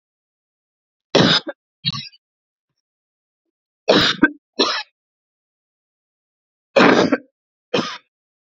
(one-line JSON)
{"three_cough_length": "8.5 s", "three_cough_amplitude": 32684, "three_cough_signal_mean_std_ratio": 0.32, "survey_phase": "beta (2021-08-13 to 2022-03-07)", "age": "45-64", "gender": "Female", "wearing_mask": "No", "symptom_change_to_sense_of_smell_or_taste": true, "symptom_onset": "12 days", "smoker_status": "Never smoked", "respiratory_condition_asthma": false, "respiratory_condition_other": false, "recruitment_source": "REACT", "submission_delay": "1 day", "covid_test_result": "Negative", "covid_test_method": "RT-qPCR", "influenza_a_test_result": "Negative", "influenza_b_test_result": "Negative"}